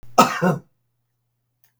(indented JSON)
{
  "cough_length": "1.8 s",
  "cough_amplitude": 32768,
  "cough_signal_mean_std_ratio": 0.32,
  "survey_phase": "beta (2021-08-13 to 2022-03-07)",
  "age": "65+",
  "gender": "Male",
  "wearing_mask": "No",
  "symptom_none": true,
  "smoker_status": "Ex-smoker",
  "respiratory_condition_asthma": false,
  "respiratory_condition_other": false,
  "recruitment_source": "REACT",
  "submission_delay": "5 days",
  "covid_test_result": "Negative",
  "covid_test_method": "RT-qPCR",
  "influenza_a_test_result": "Negative",
  "influenza_b_test_result": "Negative"
}